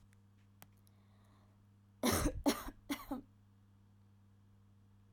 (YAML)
three_cough_length: 5.1 s
three_cough_amplitude: 3271
three_cough_signal_mean_std_ratio: 0.34
survey_phase: beta (2021-08-13 to 2022-03-07)
age: 18-44
gender: Female
wearing_mask: 'No'
symptom_abdominal_pain: true
symptom_onset: 7 days
smoker_status: Never smoked
respiratory_condition_asthma: false
respiratory_condition_other: false
recruitment_source: REACT
submission_delay: 4 days
covid_test_result: Negative
covid_test_method: RT-qPCR
influenza_a_test_result: Negative
influenza_b_test_result: Negative